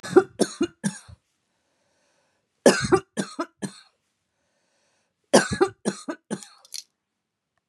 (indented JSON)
{
  "three_cough_length": "7.7 s",
  "three_cough_amplitude": 31183,
  "three_cough_signal_mean_std_ratio": 0.27,
  "survey_phase": "beta (2021-08-13 to 2022-03-07)",
  "age": "45-64",
  "gender": "Female",
  "wearing_mask": "No",
  "symptom_none": true,
  "smoker_status": "Never smoked",
  "respiratory_condition_asthma": false,
  "respiratory_condition_other": false,
  "recruitment_source": "REACT",
  "submission_delay": "2 days",
  "covid_test_result": "Negative",
  "covid_test_method": "RT-qPCR",
  "influenza_a_test_result": "Negative",
  "influenza_b_test_result": "Negative"
}